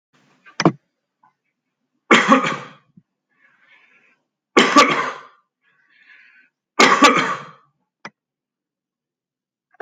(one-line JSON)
{"three_cough_length": "9.8 s", "three_cough_amplitude": 32768, "three_cough_signal_mean_std_ratio": 0.3, "survey_phase": "beta (2021-08-13 to 2022-03-07)", "age": "45-64", "gender": "Male", "wearing_mask": "No", "symptom_none": true, "smoker_status": "Ex-smoker", "respiratory_condition_asthma": false, "respiratory_condition_other": false, "recruitment_source": "REACT", "submission_delay": "1 day", "covid_test_result": "Negative", "covid_test_method": "RT-qPCR"}